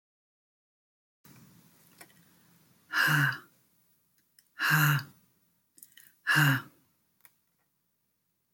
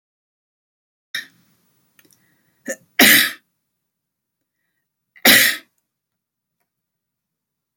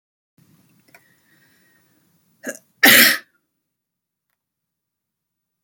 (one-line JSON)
{"exhalation_length": "8.5 s", "exhalation_amplitude": 9201, "exhalation_signal_mean_std_ratio": 0.32, "three_cough_length": "7.8 s", "three_cough_amplitude": 32768, "three_cough_signal_mean_std_ratio": 0.23, "cough_length": "5.6 s", "cough_amplitude": 32768, "cough_signal_mean_std_ratio": 0.2, "survey_phase": "alpha (2021-03-01 to 2021-08-12)", "age": "65+", "gender": "Female", "wearing_mask": "No", "symptom_none": true, "smoker_status": "Ex-smoker", "respiratory_condition_asthma": false, "respiratory_condition_other": false, "recruitment_source": "REACT", "submission_delay": "1 day", "covid_test_result": "Negative", "covid_test_method": "RT-qPCR"}